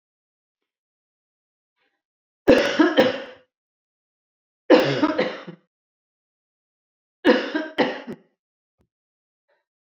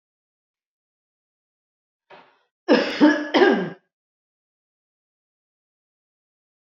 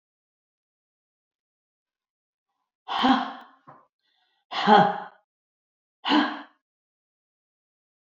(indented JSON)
{
  "three_cough_length": "9.8 s",
  "three_cough_amplitude": 26372,
  "three_cough_signal_mean_std_ratio": 0.31,
  "cough_length": "6.7 s",
  "cough_amplitude": 24250,
  "cough_signal_mean_std_ratio": 0.27,
  "exhalation_length": "8.2 s",
  "exhalation_amplitude": 21084,
  "exhalation_signal_mean_std_ratio": 0.27,
  "survey_phase": "beta (2021-08-13 to 2022-03-07)",
  "age": "65+",
  "gender": "Female",
  "wearing_mask": "No",
  "symptom_none": true,
  "symptom_onset": "5 days",
  "smoker_status": "Never smoked",
  "respiratory_condition_asthma": false,
  "respiratory_condition_other": false,
  "recruitment_source": "REACT",
  "submission_delay": "1 day",
  "covid_test_result": "Negative",
  "covid_test_method": "RT-qPCR"
}